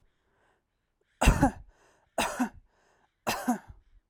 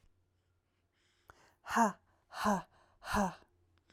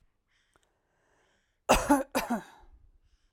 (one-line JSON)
{"three_cough_length": "4.1 s", "three_cough_amplitude": 17293, "three_cough_signal_mean_std_ratio": 0.32, "exhalation_length": "3.9 s", "exhalation_amplitude": 4813, "exhalation_signal_mean_std_ratio": 0.34, "cough_length": "3.3 s", "cough_amplitude": 11340, "cough_signal_mean_std_ratio": 0.3, "survey_phase": "alpha (2021-03-01 to 2021-08-12)", "age": "18-44", "gender": "Female", "wearing_mask": "No", "symptom_none": true, "smoker_status": "Ex-smoker", "respiratory_condition_asthma": false, "respiratory_condition_other": false, "recruitment_source": "REACT", "submission_delay": "1 day", "covid_test_result": "Negative", "covid_test_method": "RT-qPCR"}